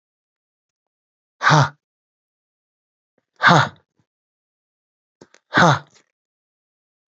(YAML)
exhalation_length: 7.1 s
exhalation_amplitude: 32044
exhalation_signal_mean_std_ratio: 0.25
survey_phase: beta (2021-08-13 to 2022-03-07)
age: 65+
gender: Male
wearing_mask: 'No'
symptom_runny_or_blocked_nose: true
smoker_status: Never smoked
respiratory_condition_asthma: false
respiratory_condition_other: false
recruitment_source: REACT
submission_delay: 3 days
covid_test_result: Negative
covid_test_method: RT-qPCR
influenza_a_test_result: Negative
influenza_b_test_result: Negative